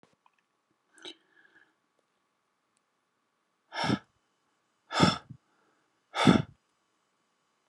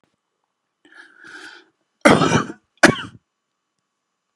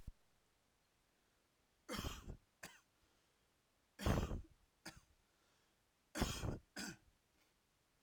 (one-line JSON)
{"exhalation_length": "7.7 s", "exhalation_amplitude": 15421, "exhalation_signal_mean_std_ratio": 0.22, "cough_length": "4.4 s", "cough_amplitude": 32768, "cough_signal_mean_std_ratio": 0.26, "three_cough_length": "8.0 s", "three_cough_amplitude": 2015, "three_cough_signal_mean_std_ratio": 0.33, "survey_phase": "alpha (2021-03-01 to 2021-08-12)", "age": "18-44", "gender": "Male", "wearing_mask": "No", "symptom_none": true, "smoker_status": "Never smoked", "respiratory_condition_asthma": false, "respiratory_condition_other": false, "recruitment_source": "REACT", "submission_delay": "1 day", "covid_test_result": "Negative", "covid_test_method": "RT-qPCR"}